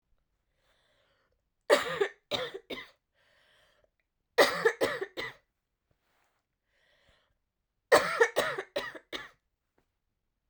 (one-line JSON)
{"three_cough_length": "10.5 s", "three_cough_amplitude": 13151, "three_cough_signal_mean_std_ratio": 0.29, "survey_phase": "beta (2021-08-13 to 2022-03-07)", "age": "18-44", "gender": "Female", "wearing_mask": "No", "symptom_runny_or_blocked_nose": true, "symptom_shortness_of_breath": true, "symptom_sore_throat": true, "symptom_fatigue": true, "symptom_headache": true, "symptom_change_to_sense_of_smell_or_taste": true, "symptom_loss_of_taste": true, "symptom_onset": "4 days", "smoker_status": "Never smoked", "respiratory_condition_asthma": true, "respiratory_condition_other": false, "recruitment_source": "Test and Trace", "submission_delay": "3 days", "covid_test_method": "RT-qPCR"}